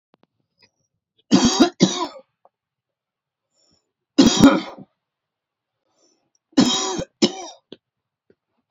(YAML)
three_cough_length: 8.7 s
three_cough_amplitude: 28818
three_cough_signal_mean_std_ratio: 0.31
survey_phase: beta (2021-08-13 to 2022-03-07)
age: 18-44
gender: Male
wearing_mask: 'No'
symptom_runny_or_blocked_nose: true
symptom_fatigue: true
smoker_status: Ex-smoker
respiratory_condition_asthma: false
respiratory_condition_other: false
recruitment_source: REACT
submission_delay: 2 days
covid_test_result: Negative
covid_test_method: RT-qPCR